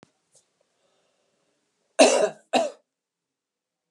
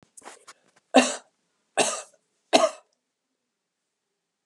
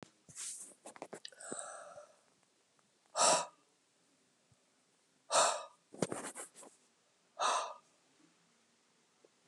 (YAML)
cough_length: 3.9 s
cough_amplitude: 24943
cough_signal_mean_std_ratio: 0.25
three_cough_length: 4.5 s
three_cough_amplitude: 26855
three_cough_signal_mean_std_ratio: 0.25
exhalation_length: 9.5 s
exhalation_amplitude: 5690
exhalation_signal_mean_std_ratio: 0.32
survey_phase: beta (2021-08-13 to 2022-03-07)
age: 65+
gender: Female
wearing_mask: 'No'
symptom_none: true
smoker_status: Never smoked
respiratory_condition_asthma: true
respiratory_condition_other: false
recruitment_source: REACT
submission_delay: 2 days
covid_test_result: Negative
covid_test_method: RT-qPCR